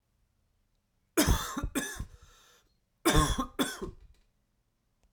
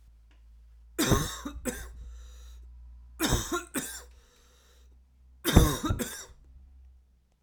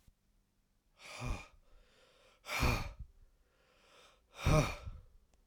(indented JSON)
{
  "cough_length": "5.1 s",
  "cough_amplitude": 9950,
  "cough_signal_mean_std_ratio": 0.38,
  "three_cough_length": "7.4 s",
  "three_cough_amplitude": 23150,
  "three_cough_signal_mean_std_ratio": 0.39,
  "exhalation_length": "5.5 s",
  "exhalation_amplitude": 4356,
  "exhalation_signal_mean_std_ratio": 0.35,
  "survey_phase": "alpha (2021-03-01 to 2021-08-12)",
  "age": "45-64",
  "gender": "Male",
  "wearing_mask": "No",
  "symptom_cough_any": true,
  "symptom_fatigue": true,
  "symptom_fever_high_temperature": true,
  "symptom_headache": true,
  "symptom_onset": "3 days",
  "smoker_status": "Never smoked",
  "respiratory_condition_asthma": false,
  "respiratory_condition_other": false,
  "recruitment_source": "Test and Trace",
  "submission_delay": "2 days",
  "covid_test_result": "Positive",
  "covid_test_method": "RT-qPCR"
}